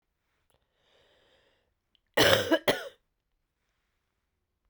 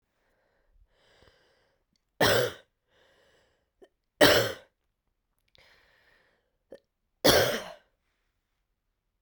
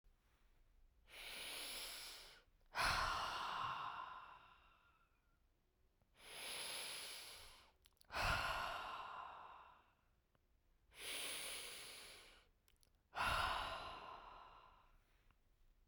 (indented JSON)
{
  "cough_length": "4.7 s",
  "cough_amplitude": 16069,
  "cough_signal_mean_std_ratio": 0.25,
  "three_cough_length": "9.2 s",
  "three_cough_amplitude": 20564,
  "three_cough_signal_mean_std_ratio": 0.25,
  "exhalation_length": "15.9 s",
  "exhalation_amplitude": 1490,
  "exhalation_signal_mean_std_ratio": 0.56,
  "survey_phase": "beta (2021-08-13 to 2022-03-07)",
  "age": "18-44",
  "gender": "Female",
  "wearing_mask": "No",
  "symptom_cough_any": true,
  "symptom_new_continuous_cough": true,
  "symptom_runny_or_blocked_nose": true,
  "symptom_sore_throat": true,
  "symptom_fatigue": true,
  "symptom_fever_high_temperature": true,
  "symptom_headache": true,
  "symptom_change_to_sense_of_smell_or_taste": true,
  "symptom_loss_of_taste": true,
  "symptom_onset": "2 days",
  "smoker_status": "Ex-smoker",
  "respiratory_condition_asthma": true,
  "respiratory_condition_other": false,
  "recruitment_source": "Test and Trace",
  "submission_delay": "1 day",
  "covid_test_result": "Positive",
  "covid_test_method": "RT-qPCR",
  "covid_ct_value": 26.4,
  "covid_ct_gene": "ORF1ab gene",
  "covid_ct_mean": 27.1,
  "covid_viral_load": "1300 copies/ml",
  "covid_viral_load_category": "Minimal viral load (< 10K copies/ml)"
}